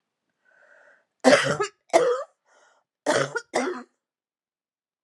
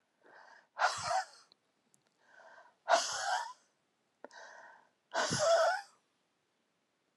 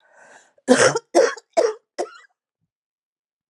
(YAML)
three_cough_length: 5.0 s
three_cough_amplitude: 28655
three_cough_signal_mean_std_ratio: 0.36
exhalation_length: 7.2 s
exhalation_amplitude: 6337
exhalation_signal_mean_std_ratio: 0.4
cough_length: 3.5 s
cough_amplitude: 31432
cough_signal_mean_std_ratio: 0.34
survey_phase: alpha (2021-03-01 to 2021-08-12)
age: 45-64
gender: Female
wearing_mask: 'No'
symptom_cough_any: true
symptom_shortness_of_breath: true
symptom_fatigue: true
symptom_headache: true
symptom_change_to_sense_of_smell_or_taste: true
symptom_onset: 3 days
smoker_status: Ex-smoker
respiratory_condition_asthma: false
respiratory_condition_other: false
recruitment_source: Test and Trace
submission_delay: 2 days
covid_test_result: Positive
covid_test_method: RT-qPCR
covid_ct_value: 17.8
covid_ct_gene: ORF1ab gene
covid_ct_mean: 18.2
covid_viral_load: 1100000 copies/ml
covid_viral_load_category: High viral load (>1M copies/ml)